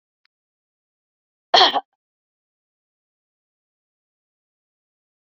{"cough_length": "5.4 s", "cough_amplitude": 31132, "cough_signal_mean_std_ratio": 0.15, "survey_phase": "beta (2021-08-13 to 2022-03-07)", "age": "65+", "gender": "Female", "wearing_mask": "No", "symptom_none": true, "smoker_status": "Never smoked", "respiratory_condition_asthma": false, "respiratory_condition_other": false, "recruitment_source": "REACT", "submission_delay": "1 day", "covid_test_result": "Negative", "covid_test_method": "RT-qPCR", "influenza_a_test_result": "Negative", "influenza_b_test_result": "Negative"}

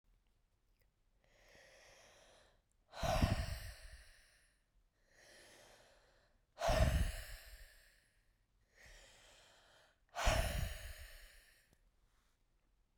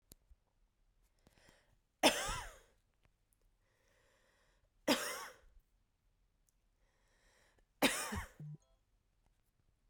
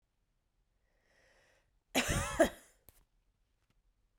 {"exhalation_length": "13.0 s", "exhalation_amplitude": 3635, "exhalation_signal_mean_std_ratio": 0.34, "three_cough_length": "9.9 s", "three_cough_amplitude": 6343, "three_cough_signal_mean_std_ratio": 0.25, "cough_length": "4.2 s", "cough_amplitude": 6713, "cough_signal_mean_std_ratio": 0.25, "survey_phase": "beta (2021-08-13 to 2022-03-07)", "age": "18-44", "gender": "Female", "wearing_mask": "No", "symptom_cough_any": true, "symptom_runny_or_blocked_nose": true, "symptom_shortness_of_breath": true, "symptom_sore_throat": true, "symptom_fatigue": true, "symptom_fever_high_temperature": true, "symptom_headache": true, "symptom_change_to_sense_of_smell_or_taste": true, "symptom_onset": "3 days", "smoker_status": "Never smoked", "respiratory_condition_asthma": false, "respiratory_condition_other": false, "recruitment_source": "Test and Trace", "submission_delay": "2 days", "covid_test_result": "Positive", "covid_test_method": "RT-qPCR", "covid_ct_value": 17.5, "covid_ct_gene": "ORF1ab gene", "covid_ct_mean": 20.2, "covid_viral_load": "230000 copies/ml", "covid_viral_load_category": "Low viral load (10K-1M copies/ml)"}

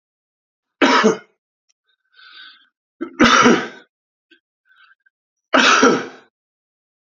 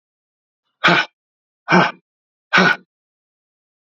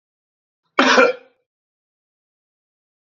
{"three_cough_length": "7.1 s", "three_cough_amplitude": 31134, "three_cough_signal_mean_std_ratio": 0.35, "exhalation_length": "3.8 s", "exhalation_amplitude": 31056, "exhalation_signal_mean_std_ratio": 0.32, "cough_length": "3.1 s", "cough_amplitude": 28611, "cough_signal_mean_std_ratio": 0.27, "survey_phase": "alpha (2021-03-01 to 2021-08-12)", "age": "45-64", "gender": "Male", "wearing_mask": "No", "symptom_cough_any": true, "symptom_shortness_of_breath": true, "smoker_status": "Ex-smoker", "respiratory_condition_asthma": false, "respiratory_condition_other": false, "recruitment_source": "Test and Trace", "submission_delay": "2 days", "covid_test_result": "Positive", "covid_test_method": "RT-qPCR", "covid_ct_value": 21.8, "covid_ct_gene": "ORF1ab gene"}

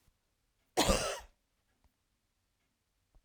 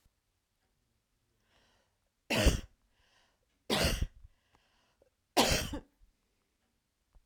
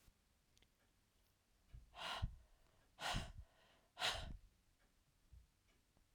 {"cough_length": "3.2 s", "cough_amplitude": 7451, "cough_signal_mean_std_ratio": 0.26, "three_cough_length": "7.3 s", "three_cough_amplitude": 8197, "three_cough_signal_mean_std_ratio": 0.29, "exhalation_length": "6.1 s", "exhalation_amplitude": 1352, "exhalation_signal_mean_std_ratio": 0.38, "survey_phase": "beta (2021-08-13 to 2022-03-07)", "age": "45-64", "gender": "Female", "wearing_mask": "No", "symptom_none": true, "symptom_onset": "10 days", "smoker_status": "Never smoked", "respiratory_condition_asthma": false, "respiratory_condition_other": false, "recruitment_source": "REACT", "submission_delay": "2 days", "covid_test_result": "Negative", "covid_test_method": "RT-qPCR", "influenza_a_test_result": "Unknown/Void", "influenza_b_test_result": "Unknown/Void"}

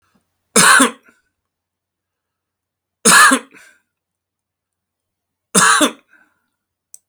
{"three_cough_length": "7.1 s", "three_cough_amplitude": 32768, "three_cough_signal_mean_std_ratio": 0.31, "survey_phase": "beta (2021-08-13 to 2022-03-07)", "age": "45-64", "gender": "Male", "wearing_mask": "No", "symptom_none": true, "smoker_status": "Ex-smoker", "respiratory_condition_asthma": false, "respiratory_condition_other": false, "recruitment_source": "REACT", "submission_delay": "2 days", "covid_test_result": "Negative", "covid_test_method": "RT-qPCR", "influenza_a_test_result": "Unknown/Void", "influenza_b_test_result": "Unknown/Void"}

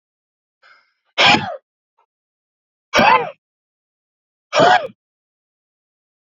{"exhalation_length": "6.4 s", "exhalation_amplitude": 30091, "exhalation_signal_mean_std_ratio": 0.3, "survey_phase": "alpha (2021-03-01 to 2021-08-12)", "age": "45-64", "gender": "Male", "wearing_mask": "No", "symptom_cough_any": true, "symptom_diarrhoea": true, "symptom_fatigue": true, "symptom_headache": true, "symptom_change_to_sense_of_smell_or_taste": true, "symptom_onset": "6 days", "smoker_status": "Never smoked", "respiratory_condition_asthma": false, "respiratory_condition_other": false, "recruitment_source": "Test and Trace", "submission_delay": "2 days", "covid_test_result": "Positive", "covid_test_method": "RT-qPCR", "covid_ct_value": 24.4, "covid_ct_gene": "S gene", "covid_ct_mean": 24.5, "covid_viral_load": "9000 copies/ml", "covid_viral_load_category": "Minimal viral load (< 10K copies/ml)"}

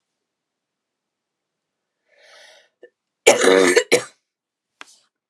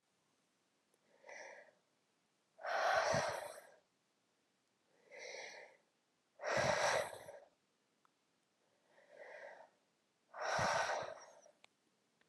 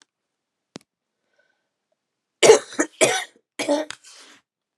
{"cough_length": "5.3 s", "cough_amplitude": 32768, "cough_signal_mean_std_ratio": 0.27, "exhalation_length": "12.3 s", "exhalation_amplitude": 2864, "exhalation_signal_mean_std_ratio": 0.4, "three_cough_length": "4.8 s", "three_cough_amplitude": 32676, "three_cough_signal_mean_std_ratio": 0.26, "survey_phase": "beta (2021-08-13 to 2022-03-07)", "age": "18-44", "gender": "Female", "wearing_mask": "No", "symptom_cough_any": true, "symptom_runny_or_blocked_nose": true, "symptom_shortness_of_breath": true, "symptom_sore_throat": true, "symptom_fatigue": true, "smoker_status": "Never smoked", "respiratory_condition_asthma": true, "respiratory_condition_other": false, "recruitment_source": "Test and Trace", "submission_delay": "2 days", "covid_test_result": "Positive", "covid_test_method": "RT-qPCR"}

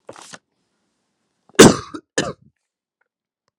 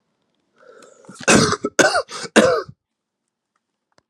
{"cough_length": "3.6 s", "cough_amplitude": 32768, "cough_signal_mean_std_ratio": 0.2, "three_cough_length": "4.1 s", "three_cough_amplitude": 32768, "three_cough_signal_mean_std_ratio": 0.36, "survey_phase": "alpha (2021-03-01 to 2021-08-12)", "age": "18-44", "gender": "Male", "wearing_mask": "No", "symptom_cough_any": true, "symptom_abdominal_pain": true, "symptom_fatigue": true, "symptom_fever_high_temperature": true, "symptom_onset": "4 days", "smoker_status": "Never smoked", "respiratory_condition_asthma": false, "respiratory_condition_other": false, "recruitment_source": "Test and Trace", "submission_delay": "2 days", "covid_test_result": "Positive", "covid_test_method": "RT-qPCR", "covid_ct_value": 22.3, "covid_ct_gene": "ORF1ab gene"}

